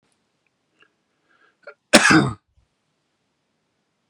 {"cough_length": "4.1 s", "cough_amplitude": 32768, "cough_signal_mean_std_ratio": 0.23, "survey_phase": "beta (2021-08-13 to 2022-03-07)", "age": "45-64", "gender": "Male", "wearing_mask": "No", "symptom_none": true, "symptom_onset": "12 days", "smoker_status": "Never smoked", "respiratory_condition_asthma": false, "respiratory_condition_other": false, "recruitment_source": "REACT", "submission_delay": "2 days", "covid_test_result": "Negative", "covid_test_method": "RT-qPCR", "influenza_a_test_result": "Negative", "influenza_b_test_result": "Negative"}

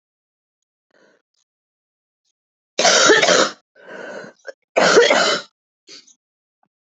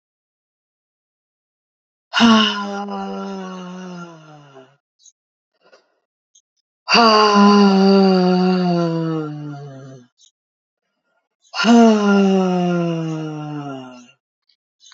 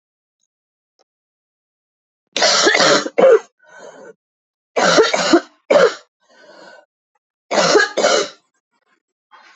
{"cough_length": "6.8 s", "cough_amplitude": 29102, "cough_signal_mean_std_ratio": 0.37, "exhalation_length": "14.9 s", "exhalation_amplitude": 32767, "exhalation_signal_mean_std_ratio": 0.5, "three_cough_length": "9.6 s", "three_cough_amplitude": 32767, "three_cough_signal_mean_std_ratio": 0.41, "survey_phase": "alpha (2021-03-01 to 2021-08-12)", "age": "45-64", "gender": "Female", "wearing_mask": "No", "symptom_cough_any": true, "symptom_fatigue": true, "symptom_change_to_sense_of_smell_or_taste": true, "symptom_loss_of_taste": true, "symptom_onset": "2 days", "smoker_status": "Never smoked", "respiratory_condition_asthma": false, "respiratory_condition_other": false, "recruitment_source": "Test and Trace", "submission_delay": "2 days", "covid_test_result": "Positive", "covid_test_method": "RT-qPCR", "covid_ct_value": 23.7, "covid_ct_gene": "ORF1ab gene", "covid_ct_mean": 25.1, "covid_viral_load": "5600 copies/ml", "covid_viral_load_category": "Minimal viral load (< 10K copies/ml)"}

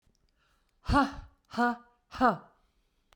{"exhalation_length": "3.2 s", "exhalation_amplitude": 8935, "exhalation_signal_mean_std_ratio": 0.35, "survey_phase": "beta (2021-08-13 to 2022-03-07)", "age": "65+", "gender": "Female", "wearing_mask": "No", "symptom_none": true, "smoker_status": "Ex-smoker", "respiratory_condition_asthma": false, "respiratory_condition_other": false, "recruitment_source": "REACT", "submission_delay": "2 days", "covid_test_result": "Negative", "covid_test_method": "RT-qPCR"}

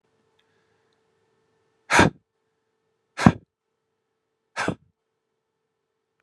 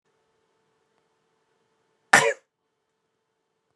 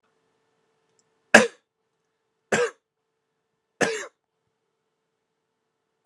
{"exhalation_length": "6.2 s", "exhalation_amplitude": 32768, "exhalation_signal_mean_std_ratio": 0.18, "cough_length": "3.8 s", "cough_amplitude": 32767, "cough_signal_mean_std_ratio": 0.16, "three_cough_length": "6.1 s", "three_cough_amplitude": 32768, "three_cough_signal_mean_std_ratio": 0.18, "survey_phase": "beta (2021-08-13 to 2022-03-07)", "age": "18-44", "gender": "Male", "wearing_mask": "No", "symptom_none": true, "smoker_status": "Never smoked", "respiratory_condition_asthma": true, "respiratory_condition_other": false, "recruitment_source": "Test and Trace", "submission_delay": "0 days", "covid_test_result": "Negative", "covid_test_method": "LFT"}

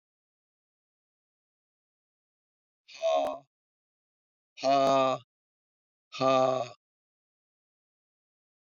{"exhalation_length": "8.7 s", "exhalation_amplitude": 7983, "exhalation_signal_mean_std_ratio": 0.31, "survey_phase": "beta (2021-08-13 to 2022-03-07)", "age": "65+", "gender": "Male", "wearing_mask": "No", "symptom_cough_any": true, "symptom_runny_or_blocked_nose": true, "symptom_sore_throat": true, "symptom_fatigue": true, "symptom_other": true, "smoker_status": "Never smoked", "respiratory_condition_asthma": false, "respiratory_condition_other": false, "recruitment_source": "Test and Trace", "submission_delay": "2 days", "covid_test_result": "Positive", "covid_test_method": "RT-qPCR", "covid_ct_value": 18.3, "covid_ct_gene": "ORF1ab gene", "covid_ct_mean": 18.7, "covid_viral_load": "730000 copies/ml", "covid_viral_load_category": "Low viral load (10K-1M copies/ml)"}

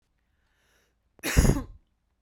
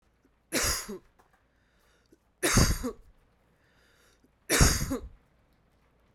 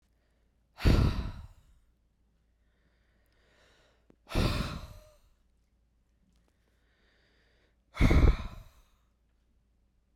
{"cough_length": "2.2 s", "cough_amplitude": 16459, "cough_signal_mean_std_ratio": 0.3, "three_cough_length": "6.1 s", "three_cough_amplitude": 14339, "three_cough_signal_mean_std_ratio": 0.35, "exhalation_length": "10.2 s", "exhalation_amplitude": 11123, "exhalation_signal_mean_std_ratio": 0.28, "survey_phase": "beta (2021-08-13 to 2022-03-07)", "age": "18-44", "gender": "Female", "wearing_mask": "No", "symptom_cough_any": true, "smoker_status": "Ex-smoker", "respiratory_condition_asthma": true, "respiratory_condition_other": false, "recruitment_source": "REACT", "submission_delay": "1 day", "covid_test_result": "Negative", "covid_test_method": "RT-qPCR"}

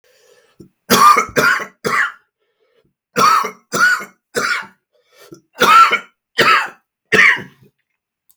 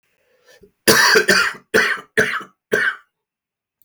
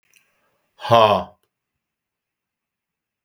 {"three_cough_length": "8.4 s", "three_cough_amplitude": 32768, "three_cough_signal_mean_std_ratio": 0.46, "cough_length": "3.8 s", "cough_amplitude": 32768, "cough_signal_mean_std_ratio": 0.47, "exhalation_length": "3.2 s", "exhalation_amplitude": 32766, "exhalation_signal_mean_std_ratio": 0.25, "survey_phase": "beta (2021-08-13 to 2022-03-07)", "age": "45-64", "gender": "Female", "wearing_mask": "No", "symptom_cough_any": true, "symptom_new_continuous_cough": true, "symptom_runny_or_blocked_nose": true, "symptom_shortness_of_breath": true, "smoker_status": "Never smoked", "respiratory_condition_asthma": true, "respiratory_condition_other": false, "recruitment_source": "Test and Trace", "submission_delay": "1 day", "covid_test_result": "Negative", "covid_test_method": "RT-qPCR"}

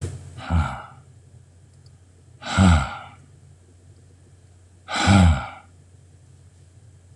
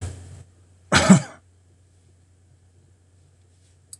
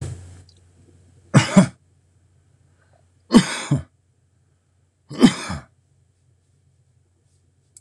{"exhalation_length": "7.2 s", "exhalation_amplitude": 21311, "exhalation_signal_mean_std_ratio": 0.37, "cough_length": "4.0 s", "cough_amplitude": 26027, "cough_signal_mean_std_ratio": 0.24, "three_cough_length": "7.8 s", "three_cough_amplitude": 26028, "three_cough_signal_mean_std_ratio": 0.25, "survey_phase": "beta (2021-08-13 to 2022-03-07)", "age": "65+", "gender": "Male", "wearing_mask": "No", "symptom_none": true, "smoker_status": "Never smoked", "respiratory_condition_asthma": false, "respiratory_condition_other": false, "recruitment_source": "REACT", "submission_delay": "1 day", "covid_test_result": "Negative", "covid_test_method": "RT-qPCR"}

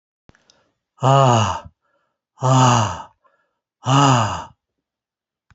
{"exhalation_length": "5.5 s", "exhalation_amplitude": 30104, "exhalation_signal_mean_std_ratio": 0.43, "survey_phase": "alpha (2021-03-01 to 2021-08-12)", "age": "65+", "gender": "Male", "wearing_mask": "No", "symptom_none": true, "smoker_status": "Never smoked", "respiratory_condition_asthma": false, "respiratory_condition_other": false, "recruitment_source": "REACT", "submission_delay": "2 days", "covid_test_result": "Negative", "covid_test_method": "RT-qPCR"}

